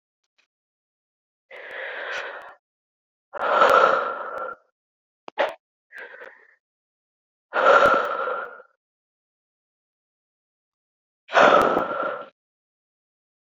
{
  "exhalation_length": "13.6 s",
  "exhalation_amplitude": 26240,
  "exhalation_signal_mean_std_ratio": 0.36,
  "survey_phase": "beta (2021-08-13 to 2022-03-07)",
  "age": "18-44",
  "gender": "Female",
  "wearing_mask": "No",
  "symptom_runny_or_blocked_nose": true,
  "symptom_sore_throat": true,
  "symptom_headache": true,
  "symptom_change_to_sense_of_smell_or_taste": true,
  "symptom_loss_of_taste": true,
  "smoker_status": "Never smoked",
  "respiratory_condition_asthma": false,
  "respiratory_condition_other": false,
  "recruitment_source": "Test and Trace",
  "submission_delay": "2 days",
  "covid_test_result": "Positive",
  "covid_test_method": "RT-qPCR",
  "covid_ct_value": 17.8,
  "covid_ct_gene": "N gene",
  "covid_ct_mean": 18.4,
  "covid_viral_load": "960000 copies/ml",
  "covid_viral_load_category": "Low viral load (10K-1M copies/ml)"
}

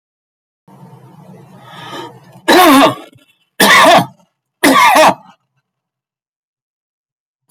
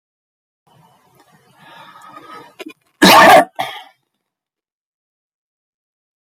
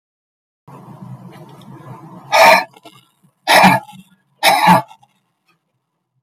{
  "three_cough_length": "7.5 s",
  "three_cough_amplitude": 32768,
  "three_cough_signal_mean_std_ratio": 0.41,
  "cough_length": "6.2 s",
  "cough_amplitude": 32768,
  "cough_signal_mean_std_ratio": 0.26,
  "exhalation_length": "6.2 s",
  "exhalation_amplitude": 32632,
  "exhalation_signal_mean_std_ratio": 0.36,
  "survey_phase": "alpha (2021-03-01 to 2021-08-12)",
  "age": "45-64",
  "gender": "Male",
  "wearing_mask": "No",
  "symptom_none": true,
  "smoker_status": "Never smoked",
  "respiratory_condition_asthma": false,
  "respiratory_condition_other": false,
  "recruitment_source": "REACT",
  "submission_delay": "2 days",
  "covid_test_result": "Negative",
  "covid_test_method": "RT-qPCR"
}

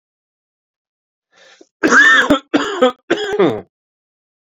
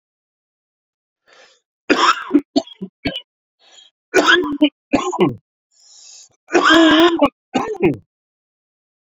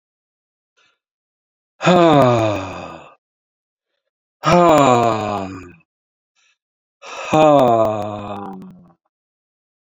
{
  "cough_length": "4.4 s",
  "cough_amplitude": 29692,
  "cough_signal_mean_std_ratio": 0.43,
  "three_cough_length": "9.0 s",
  "three_cough_amplitude": 30700,
  "three_cough_signal_mean_std_ratio": 0.42,
  "exhalation_length": "10.0 s",
  "exhalation_amplitude": 30694,
  "exhalation_signal_mean_std_ratio": 0.42,
  "survey_phase": "beta (2021-08-13 to 2022-03-07)",
  "age": "45-64",
  "gender": "Male",
  "wearing_mask": "Yes",
  "symptom_cough_any": true,
  "symptom_runny_or_blocked_nose": true,
  "symptom_shortness_of_breath": true,
  "symptom_sore_throat": true,
  "symptom_fatigue": true,
  "symptom_headache": true,
  "symptom_change_to_sense_of_smell_or_taste": true,
  "symptom_loss_of_taste": true,
  "symptom_onset": "5 days",
  "smoker_status": "Current smoker (e-cigarettes or vapes only)",
  "respiratory_condition_asthma": false,
  "respiratory_condition_other": false,
  "recruitment_source": "Test and Trace",
  "submission_delay": "1 day",
  "covid_test_result": "Positive",
  "covid_test_method": "RT-qPCR",
  "covid_ct_value": 14.7,
  "covid_ct_gene": "ORF1ab gene",
  "covid_ct_mean": 15.1,
  "covid_viral_load": "11000000 copies/ml",
  "covid_viral_load_category": "High viral load (>1M copies/ml)"
}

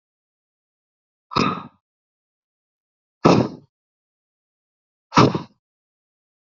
{
  "exhalation_length": "6.5 s",
  "exhalation_amplitude": 32768,
  "exhalation_signal_mean_std_ratio": 0.23,
  "survey_phase": "beta (2021-08-13 to 2022-03-07)",
  "age": "45-64",
  "gender": "Male",
  "wearing_mask": "No",
  "symptom_none": true,
  "smoker_status": "Never smoked",
  "respiratory_condition_asthma": false,
  "respiratory_condition_other": false,
  "recruitment_source": "Test and Trace",
  "submission_delay": "0 days",
  "covid_test_result": "Negative",
  "covid_test_method": "LFT"
}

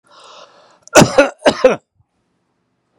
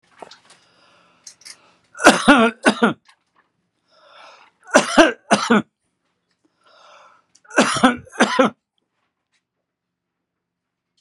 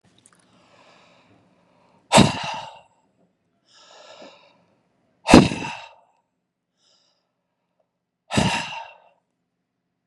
{
  "cough_length": "3.0 s",
  "cough_amplitude": 32768,
  "cough_signal_mean_std_ratio": 0.32,
  "three_cough_length": "11.0 s",
  "three_cough_amplitude": 32768,
  "three_cough_signal_mean_std_ratio": 0.31,
  "exhalation_length": "10.1 s",
  "exhalation_amplitude": 32768,
  "exhalation_signal_mean_std_ratio": 0.22,
  "survey_phase": "beta (2021-08-13 to 2022-03-07)",
  "age": "65+",
  "gender": "Male",
  "wearing_mask": "No",
  "symptom_none": true,
  "smoker_status": "Never smoked",
  "respiratory_condition_asthma": false,
  "respiratory_condition_other": false,
  "recruitment_source": "Test and Trace",
  "submission_delay": "1 day",
  "covid_test_result": "Negative",
  "covid_test_method": "LFT"
}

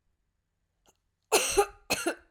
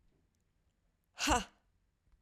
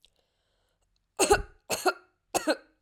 {
  "cough_length": "2.3 s",
  "cough_amplitude": 11018,
  "cough_signal_mean_std_ratio": 0.36,
  "exhalation_length": "2.2 s",
  "exhalation_amplitude": 5180,
  "exhalation_signal_mean_std_ratio": 0.26,
  "three_cough_length": "2.8 s",
  "three_cough_amplitude": 12646,
  "three_cough_signal_mean_std_ratio": 0.32,
  "survey_phase": "beta (2021-08-13 to 2022-03-07)",
  "age": "18-44",
  "gender": "Female",
  "wearing_mask": "No",
  "symptom_cough_any": true,
  "symptom_runny_or_blocked_nose": true,
  "symptom_sore_throat": true,
  "symptom_fatigue": true,
  "symptom_change_to_sense_of_smell_or_taste": true,
  "symptom_loss_of_taste": true,
  "symptom_onset": "2 days",
  "smoker_status": "Never smoked",
  "respiratory_condition_asthma": false,
  "respiratory_condition_other": false,
  "recruitment_source": "Test and Trace",
  "submission_delay": "2 days",
  "covid_test_result": "Positive",
  "covid_test_method": "RT-qPCR",
  "covid_ct_value": 20.7,
  "covid_ct_gene": "ORF1ab gene",
  "covid_ct_mean": 21.0,
  "covid_viral_load": "130000 copies/ml",
  "covid_viral_load_category": "Low viral load (10K-1M copies/ml)"
}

